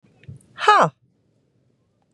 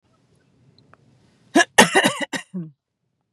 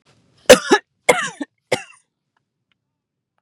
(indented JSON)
{
  "exhalation_length": "2.1 s",
  "exhalation_amplitude": 31235,
  "exhalation_signal_mean_std_ratio": 0.26,
  "cough_length": "3.3 s",
  "cough_amplitude": 32768,
  "cough_signal_mean_std_ratio": 0.29,
  "three_cough_length": "3.4 s",
  "three_cough_amplitude": 32768,
  "three_cough_signal_mean_std_ratio": 0.24,
  "survey_phase": "beta (2021-08-13 to 2022-03-07)",
  "age": "45-64",
  "gender": "Female",
  "wearing_mask": "No",
  "symptom_none": true,
  "smoker_status": "Ex-smoker",
  "respiratory_condition_asthma": false,
  "respiratory_condition_other": false,
  "recruitment_source": "REACT",
  "submission_delay": "1 day",
  "covid_test_result": "Negative",
  "covid_test_method": "RT-qPCR",
  "influenza_a_test_result": "Negative",
  "influenza_b_test_result": "Negative"
}